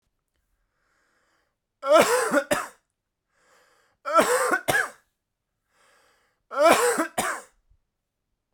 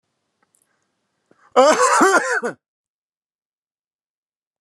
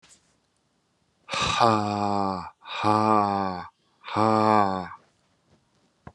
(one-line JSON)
{"three_cough_length": "8.5 s", "three_cough_amplitude": 22084, "three_cough_signal_mean_std_ratio": 0.39, "cough_length": "4.6 s", "cough_amplitude": 30202, "cough_signal_mean_std_ratio": 0.34, "exhalation_length": "6.1 s", "exhalation_amplitude": 21026, "exhalation_signal_mean_std_ratio": 0.48, "survey_phase": "beta (2021-08-13 to 2022-03-07)", "age": "45-64", "gender": "Male", "wearing_mask": "No", "symptom_none": true, "symptom_onset": "4 days", "smoker_status": "Ex-smoker", "respiratory_condition_asthma": false, "respiratory_condition_other": false, "recruitment_source": "REACT", "submission_delay": "1 day", "covid_test_result": "Negative", "covid_test_method": "RT-qPCR"}